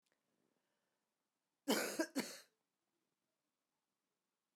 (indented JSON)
{
  "cough_length": "4.6 s",
  "cough_amplitude": 2064,
  "cough_signal_mean_std_ratio": 0.25,
  "survey_phase": "beta (2021-08-13 to 2022-03-07)",
  "age": "45-64",
  "gender": "Female",
  "wearing_mask": "No",
  "symptom_cough_any": true,
  "symptom_runny_or_blocked_nose": true,
  "symptom_sore_throat": true,
  "symptom_fatigue": true,
  "symptom_fever_high_temperature": true,
  "symptom_headache": true,
  "symptom_change_to_sense_of_smell_or_taste": true,
  "symptom_onset": "5 days",
  "smoker_status": "Ex-smoker",
  "respiratory_condition_asthma": false,
  "respiratory_condition_other": false,
  "recruitment_source": "Test and Trace",
  "submission_delay": "1 day",
  "covid_test_result": "Positive",
  "covid_test_method": "RT-qPCR",
  "covid_ct_value": 13.4,
  "covid_ct_gene": "ORF1ab gene",
  "covid_ct_mean": 14.0,
  "covid_viral_load": "26000000 copies/ml",
  "covid_viral_load_category": "High viral load (>1M copies/ml)"
}